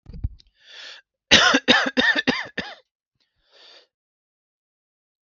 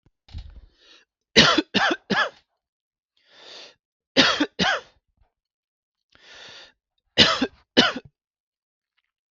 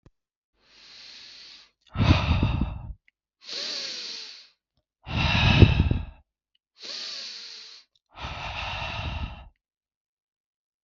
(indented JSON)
{
  "cough_length": "5.4 s",
  "cough_amplitude": 32768,
  "cough_signal_mean_std_ratio": 0.33,
  "three_cough_length": "9.3 s",
  "three_cough_amplitude": 32768,
  "three_cough_signal_mean_std_ratio": 0.32,
  "exhalation_length": "10.8 s",
  "exhalation_amplitude": 32766,
  "exhalation_signal_mean_std_ratio": 0.4,
  "survey_phase": "beta (2021-08-13 to 2022-03-07)",
  "age": "18-44",
  "gender": "Male",
  "wearing_mask": "No",
  "symptom_none": true,
  "smoker_status": "Never smoked",
  "respiratory_condition_asthma": false,
  "respiratory_condition_other": false,
  "recruitment_source": "REACT",
  "submission_delay": "1 day",
  "covid_test_result": "Negative",
  "covid_test_method": "RT-qPCR",
  "influenza_a_test_result": "Negative",
  "influenza_b_test_result": "Negative"
}